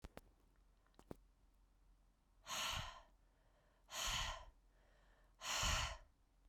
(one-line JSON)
{"exhalation_length": "6.5 s", "exhalation_amplitude": 1358, "exhalation_signal_mean_std_ratio": 0.45, "survey_phase": "beta (2021-08-13 to 2022-03-07)", "age": "18-44", "gender": "Female", "wearing_mask": "No", "symptom_cough_any": true, "symptom_runny_or_blocked_nose": true, "symptom_fatigue": true, "symptom_fever_high_temperature": true, "symptom_change_to_sense_of_smell_or_taste": true, "symptom_loss_of_taste": true, "symptom_onset": "3 days", "smoker_status": "Never smoked", "respiratory_condition_asthma": false, "respiratory_condition_other": false, "recruitment_source": "Test and Trace", "submission_delay": "2 days", "covid_test_result": "Positive", "covid_test_method": "RT-qPCR", "covid_ct_value": 16.2, "covid_ct_gene": "ORF1ab gene", "covid_ct_mean": 16.7, "covid_viral_load": "3300000 copies/ml", "covid_viral_load_category": "High viral load (>1M copies/ml)"}